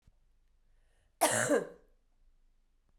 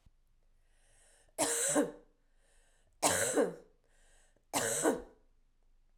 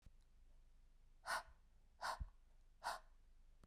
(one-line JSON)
{"cough_length": "3.0 s", "cough_amplitude": 7777, "cough_signal_mean_std_ratio": 0.32, "three_cough_length": "6.0 s", "three_cough_amplitude": 9119, "three_cough_signal_mean_std_ratio": 0.42, "exhalation_length": "3.7 s", "exhalation_amplitude": 925, "exhalation_signal_mean_std_ratio": 0.49, "survey_phase": "beta (2021-08-13 to 2022-03-07)", "age": "45-64", "gender": "Female", "wearing_mask": "No", "symptom_cough_any": true, "symptom_runny_or_blocked_nose": true, "symptom_shortness_of_breath": true, "symptom_sore_throat": true, "symptom_fatigue": true, "symptom_change_to_sense_of_smell_or_taste": true, "symptom_loss_of_taste": true, "symptom_onset": "3 days", "smoker_status": "Never smoked", "respiratory_condition_asthma": false, "respiratory_condition_other": false, "recruitment_source": "Test and Trace", "submission_delay": "2 days", "covid_test_result": "Positive", "covid_test_method": "RT-qPCR"}